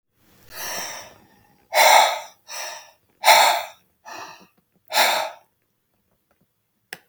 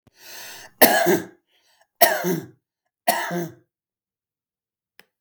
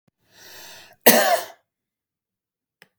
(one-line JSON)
{"exhalation_length": "7.1 s", "exhalation_amplitude": 32766, "exhalation_signal_mean_std_ratio": 0.36, "three_cough_length": "5.2 s", "three_cough_amplitude": 32768, "three_cough_signal_mean_std_ratio": 0.35, "cough_length": "3.0 s", "cough_amplitude": 32768, "cough_signal_mean_std_ratio": 0.27, "survey_phase": "beta (2021-08-13 to 2022-03-07)", "age": "45-64", "gender": "Male", "wearing_mask": "No", "symptom_none": true, "smoker_status": "Ex-smoker", "respiratory_condition_asthma": false, "respiratory_condition_other": false, "recruitment_source": "REACT", "submission_delay": "2 days", "covid_test_result": "Negative", "covid_test_method": "RT-qPCR", "influenza_a_test_result": "Negative", "influenza_b_test_result": "Negative"}